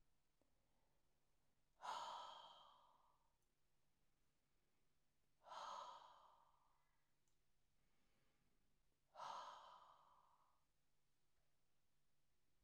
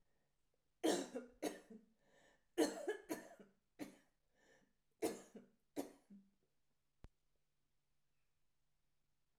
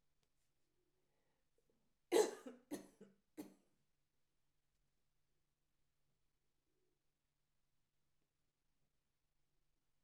exhalation_length: 12.6 s
exhalation_amplitude: 338
exhalation_signal_mean_std_ratio: 0.44
cough_length: 9.4 s
cough_amplitude: 2256
cough_signal_mean_std_ratio: 0.29
three_cough_length: 10.0 s
three_cough_amplitude: 2552
three_cough_signal_mean_std_ratio: 0.15
survey_phase: alpha (2021-03-01 to 2021-08-12)
age: 65+
gender: Female
wearing_mask: 'No'
symptom_none: true
smoker_status: Never smoked
respiratory_condition_asthma: false
respiratory_condition_other: true
recruitment_source: REACT
submission_delay: 3 days
covid_test_result: Negative
covid_test_method: RT-qPCR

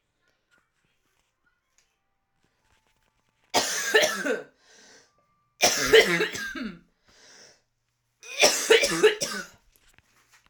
three_cough_length: 10.5 s
three_cough_amplitude: 22823
three_cough_signal_mean_std_ratio: 0.35
survey_phase: alpha (2021-03-01 to 2021-08-12)
age: 18-44
gender: Female
wearing_mask: 'No'
symptom_cough_any: true
symptom_new_continuous_cough: true
symptom_abdominal_pain: true
symptom_fatigue: true
symptom_fever_high_temperature: true
symptom_headache: true
smoker_status: Never smoked
respiratory_condition_asthma: false
respiratory_condition_other: false
recruitment_source: Test and Trace
submission_delay: 2 days
covid_test_result: Positive
covid_test_method: RT-qPCR
covid_ct_value: 29.2
covid_ct_gene: ORF1ab gene
covid_ct_mean: 30.0
covid_viral_load: 140 copies/ml
covid_viral_load_category: Minimal viral load (< 10K copies/ml)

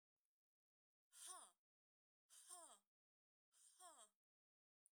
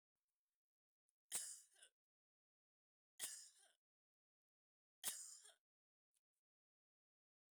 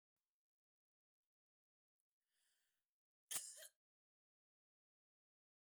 exhalation_length: 4.9 s
exhalation_amplitude: 196
exhalation_signal_mean_std_ratio: 0.37
three_cough_length: 7.5 s
three_cough_amplitude: 1087
three_cough_signal_mean_std_ratio: 0.24
cough_length: 5.6 s
cough_amplitude: 1279
cough_signal_mean_std_ratio: 0.15
survey_phase: beta (2021-08-13 to 2022-03-07)
age: 65+
gender: Female
wearing_mask: 'No'
symptom_none: true
smoker_status: Never smoked
respiratory_condition_asthma: false
respiratory_condition_other: false
recruitment_source: REACT
submission_delay: 1 day
covid_test_result: Negative
covid_test_method: RT-qPCR
influenza_a_test_result: Negative
influenza_b_test_result: Negative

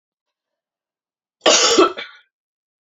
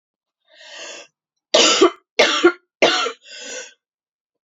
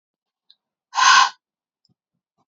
cough_length: 2.8 s
cough_amplitude: 32767
cough_signal_mean_std_ratio: 0.33
three_cough_length: 4.4 s
three_cough_amplitude: 31234
three_cough_signal_mean_std_ratio: 0.39
exhalation_length: 2.5 s
exhalation_amplitude: 26258
exhalation_signal_mean_std_ratio: 0.29
survey_phase: alpha (2021-03-01 to 2021-08-12)
age: 18-44
gender: Female
wearing_mask: 'No'
symptom_cough_any: true
symptom_new_continuous_cough: true
symptom_fatigue: true
symptom_onset: 4 days
smoker_status: Prefer not to say
respiratory_condition_asthma: false
respiratory_condition_other: false
recruitment_source: Test and Trace
submission_delay: 3 days
covid_test_result: Positive
covid_test_method: RT-qPCR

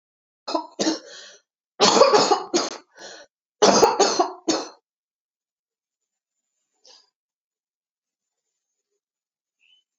cough_length: 10.0 s
cough_amplitude: 27731
cough_signal_mean_std_ratio: 0.33
survey_phase: alpha (2021-03-01 to 2021-08-12)
age: 45-64
gender: Female
wearing_mask: 'No'
symptom_cough_any: true
symptom_fatigue: true
symptom_onset: 5 days
smoker_status: Ex-smoker
respiratory_condition_asthma: false
respiratory_condition_other: false
recruitment_source: Test and Trace
submission_delay: 2 days
covid_test_result: Positive
covid_test_method: RT-qPCR
covid_ct_value: 11.5
covid_ct_gene: ORF1ab gene
covid_ct_mean: 12.3
covid_viral_load: 93000000 copies/ml
covid_viral_load_category: High viral load (>1M copies/ml)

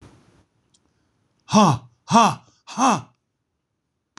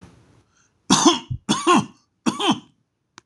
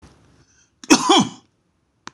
exhalation_length: 4.2 s
exhalation_amplitude: 25893
exhalation_signal_mean_std_ratio: 0.33
three_cough_length: 3.3 s
three_cough_amplitude: 26027
three_cough_signal_mean_std_ratio: 0.42
cough_length: 2.1 s
cough_amplitude: 26028
cough_signal_mean_std_ratio: 0.31
survey_phase: beta (2021-08-13 to 2022-03-07)
age: 45-64
gender: Male
wearing_mask: 'No'
symptom_none: true
smoker_status: Ex-smoker
respiratory_condition_asthma: false
respiratory_condition_other: false
recruitment_source: REACT
submission_delay: 1 day
covid_test_result: Negative
covid_test_method: RT-qPCR
influenza_a_test_result: Unknown/Void
influenza_b_test_result: Unknown/Void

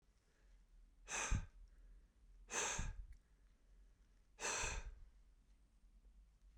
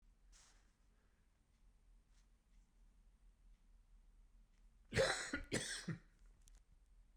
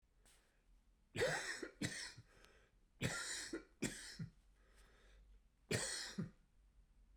exhalation_length: 6.6 s
exhalation_amplitude: 1560
exhalation_signal_mean_std_ratio: 0.47
cough_length: 7.2 s
cough_amplitude: 2112
cough_signal_mean_std_ratio: 0.33
three_cough_length: 7.2 s
three_cough_amplitude: 2226
three_cough_signal_mean_std_ratio: 0.49
survey_phase: beta (2021-08-13 to 2022-03-07)
age: 65+
gender: Male
wearing_mask: 'No'
symptom_none: true
symptom_onset: 8 days
smoker_status: Never smoked
respiratory_condition_asthma: true
respiratory_condition_other: false
recruitment_source: REACT
submission_delay: 2 days
covid_test_result: Negative
covid_test_method: RT-qPCR
influenza_a_test_result: Negative
influenza_b_test_result: Negative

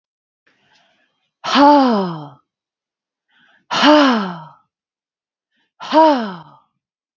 exhalation_length: 7.2 s
exhalation_amplitude: 32768
exhalation_signal_mean_std_ratio: 0.39
survey_phase: beta (2021-08-13 to 2022-03-07)
age: 45-64
gender: Female
wearing_mask: 'No'
symptom_sore_throat: true
symptom_fatigue: true
symptom_onset: 8 days
smoker_status: Never smoked
respiratory_condition_asthma: false
respiratory_condition_other: false
recruitment_source: REACT
submission_delay: 1 day
covid_test_result: Negative
covid_test_method: RT-qPCR
influenza_a_test_result: Negative
influenza_b_test_result: Negative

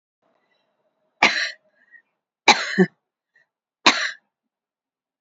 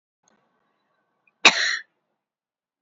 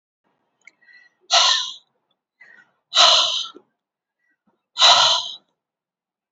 three_cough_length: 5.2 s
three_cough_amplitude: 29578
three_cough_signal_mean_std_ratio: 0.26
cough_length: 2.8 s
cough_amplitude: 29380
cough_signal_mean_std_ratio: 0.21
exhalation_length: 6.3 s
exhalation_amplitude: 32767
exhalation_signal_mean_std_ratio: 0.36
survey_phase: beta (2021-08-13 to 2022-03-07)
age: 45-64
gender: Female
wearing_mask: 'No'
symptom_cough_any: true
symptom_runny_or_blocked_nose: true
symptom_change_to_sense_of_smell_or_taste: true
smoker_status: Never smoked
respiratory_condition_asthma: true
respiratory_condition_other: false
recruitment_source: Test and Trace
submission_delay: 1 day
covid_test_result: Positive
covid_test_method: RT-qPCR
covid_ct_value: 24.2
covid_ct_gene: ORF1ab gene
covid_ct_mean: 25.1
covid_viral_load: 6000 copies/ml
covid_viral_load_category: Minimal viral load (< 10K copies/ml)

